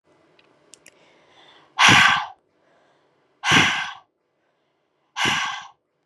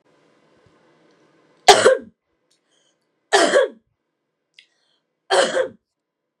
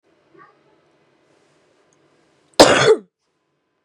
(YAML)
exhalation_length: 6.1 s
exhalation_amplitude: 29155
exhalation_signal_mean_std_ratio: 0.35
three_cough_length: 6.4 s
three_cough_amplitude: 32768
three_cough_signal_mean_std_ratio: 0.29
cough_length: 3.8 s
cough_amplitude: 32768
cough_signal_mean_std_ratio: 0.24
survey_phase: beta (2021-08-13 to 2022-03-07)
age: 18-44
gender: Female
wearing_mask: 'No'
symptom_cough_any: true
symptom_new_continuous_cough: true
symptom_runny_or_blocked_nose: true
symptom_sore_throat: true
symptom_fatigue: true
symptom_headache: true
symptom_onset: 2 days
smoker_status: Never smoked
respiratory_condition_asthma: false
respiratory_condition_other: false
recruitment_source: Test and Trace
submission_delay: 1 day
covid_test_result: Positive
covid_test_method: RT-qPCR
covid_ct_value: 21.9
covid_ct_gene: N gene